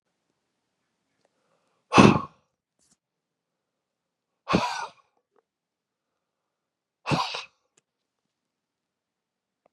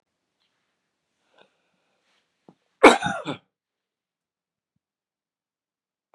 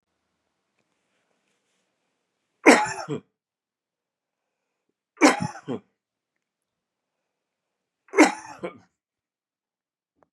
{
  "exhalation_length": "9.7 s",
  "exhalation_amplitude": 31581,
  "exhalation_signal_mean_std_ratio": 0.19,
  "cough_length": "6.1 s",
  "cough_amplitude": 32767,
  "cough_signal_mean_std_ratio": 0.14,
  "three_cough_length": "10.3 s",
  "three_cough_amplitude": 30656,
  "three_cough_signal_mean_std_ratio": 0.19,
  "survey_phase": "beta (2021-08-13 to 2022-03-07)",
  "age": "65+",
  "gender": "Male",
  "wearing_mask": "No",
  "symptom_cough_any": true,
  "symptom_runny_or_blocked_nose": true,
  "symptom_sore_throat": true,
  "symptom_onset": "2 days",
  "smoker_status": "Ex-smoker",
  "respiratory_condition_asthma": true,
  "respiratory_condition_other": false,
  "recruitment_source": "Test and Trace",
  "submission_delay": "1 day",
  "covid_test_result": "Positive",
  "covid_test_method": "RT-qPCR",
  "covid_ct_value": 16.9,
  "covid_ct_gene": "ORF1ab gene",
  "covid_ct_mean": 17.3,
  "covid_viral_load": "2100000 copies/ml",
  "covid_viral_load_category": "High viral load (>1M copies/ml)"
}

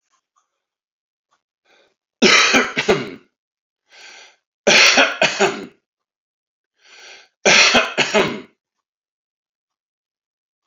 {
  "three_cough_length": "10.7 s",
  "three_cough_amplitude": 32029,
  "three_cough_signal_mean_std_ratio": 0.36,
  "survey_phase": "beta (2021-08-13 to 2022-03-07)",
  "age": "65+",
  "gender": "Male",
  "wearing_mask": "No",
  "symptom_cough_any": true,
  "symptom_runny_or_blocked_nose": true,
  "symptom_onset": "12 days",
  "smoker_status": "Ex-smoker",
  "respiratory_condition_asthma": false,
  "respiratory_condition_other": false,
  "recruitment_source": "REACT",
  "submission_delay": "1 day",
  "covid_test_result": "Negative",
  "covid_test_method": "RT-qPCR"
}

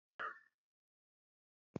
{
  "cough_length": "1.8 s",
  "cough_amplitude": 1219,
  "cough_signal_mean_std_ratio": 0.24,
  "survey_phase": "beta (2021-08-13 to 2022-03-07)",
  "age": "65+",
  "gender": "Male",
  "wearing_mask": "No",
  "symptom_none": true,
  "smoker_status": "Never smoked",
  "respiratory_condition_asthma": false,
  "respiratory_condition_other": false,
  "recruitment_source": "REACT",
  "submission_delay": "7 days",
  "covid_test_result": "Negative",
  "covid_test_method": "RT-qPCR",
  "influenza_a_test_result": "Negative",
  "influenza_b_test_result": "Negative"
}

